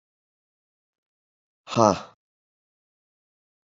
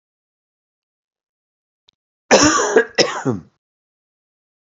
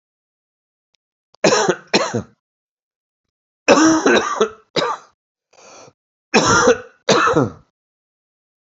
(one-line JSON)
{"exhalation_length": "3.7 s", "exhalation_amplitude": 25973, "exhalation_signal_mean_std_ratio": 0.17, "cough_length": "4.7 s", "cough_amplitude": 32311, "cough_signal_mean_std_ratio": 0.31, "three_cough_length": "8.8 s", "three_cough_amplitude": 32507, "three_cough_signal_mean_std_ratio": 0.41, "survey_phase": "alpha (2021-03-01 to 2021-08-12)", "age": "45-64", "gender": "Male", "wearing_mask": "No", "symptom_cough_any": true, "symptom_diarrhoea": true, "symptom_fatigue": true, "symptom_fever_high_temperature": true, "symptom_headache": true, "smoker_status": "Never smoked", "respiratory_condition_asthma": false, "respiratory_condition_other": false, "recruitment_source": "Test and Trace", "submission_delay": "2 days", "covid_test_result": "Positive", "covid_test_method": "LFT"}